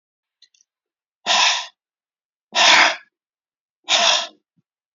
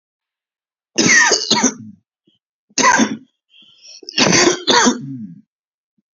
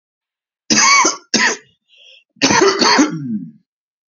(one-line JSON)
{"exhalation_length": "4.9 s", "exhalation_amplitude": 32768, "exhalation_signal_mean_std_ratio": 0.38, "three_cough_length": "6.1 s", "three_cough_amplitude": 32767, "three_cough_signal_mean_std_ratio": 0.47, "cough_length": "4.1 s", "cough_amplitude": 32767, "cough_signal_mean_std_ratio": 0.53, "survey_phase": "beta (2021-08-13 to 2022-03-07)", "age": "45-64", "gender": "Male", "wearing_mask": "No", "symptom_cough_any": true, "symptom_runny_or_blocked_nose": true, "symptom_shortness_of_breath": true, "symptom_fatigue": true, "symptom_headache": true, "symptom_onset": "4 days", "smoker_status": "Ex-smoker", "respiratory_condition_asthma": false, "respiratory_condition_other": false, "recruitment_source": "Test and Trace", "submission_delay": "2 days", "covid_test_result": "Positive", "covid_test_method": "RT-qPCR", "covid_ct_value": 21.0, "covid_ct_gene": "ORF1ab gene", "covid_ct_mean": 21.3, "covid_viral_load": "100000 copies/ml", "covid_viral_load_category": "Low viral load (10K-1M copies/ml)"}